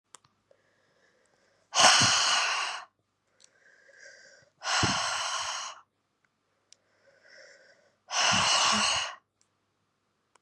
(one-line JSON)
{"exhalation_length": "10.4 s", "exhalation_amplitude": 19375, "exhalation_signal_mean_std_ratio": 0.43, "survey_phase": "beta (2021-08-13 to 2022-03-07)", "age": "18-44", "gender": "Female", "wearing_mask": "No", "symptom_cough_any": true, "symptom_new_continuous_cough": true, "symptom_runny_or_blocked_nose": true, "symptom_shortness_of_breath": true, "symptom_headache": true, "symptom_change_to_sense_of_smell_or_taste": true, "symptom_onset": "4 days", "smoker_status": "Never smoked", "respiratory_condition_asthma": false, "respiratory_condition_other": false, "recruitment_source": "Test and Trace", "submission_delay": "2 days", "covid_test_result": "Positive", "covid_test_method": "ePCR"}